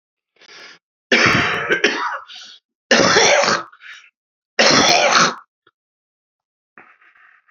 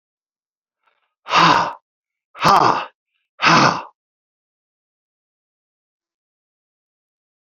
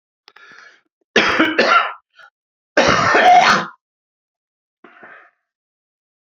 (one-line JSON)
{"three_cough_length": "7.5 s", "three_cough_amplitude": 32768, "three_cough_signal_mean_std_ratio": 0.48, "exhalation_length": "7.6 s", "exhalation_amplitude": 32767, "exhalation_signal_mean_std_ratio": 0.3, "cough_length": "6.2 s", "cough_amplitude": 32767, "cough_signal_mean_std_ratio": 0.42, "survey_phase": "beta (2021-08-13 to 2022-03-07)", "age": "65+", "gender": "Male", "wearing_mask": "No", "symptom_cough_any": true, "symptom_runny_or_blocked_nose": true, "symptom_sore_throat": true, "symptom_fatigue": true, "symptom_headache": true, "symptom_change_to_sense_of_smell_or_taste": true, "symptom_loss_of_taste": true, "smoker_status": "Never smoked", "respiratory_condition_asthma": false, "respiratory_condition_other": false, "recruitment_source": "Test and Trace", "submission_delay": "2 days", "covid_test_result": "Positive", "covid_test_method": "RT-qPCR", "covid_ct_value": 27.2, "covid_ct_gene": "ORF1ab gene", "covid_ct_mean": 27.8, "covid_viral_load": "780 copies/ml", "covid_viral_load_category": "Minimal viral load (< 10K copies/ml)"}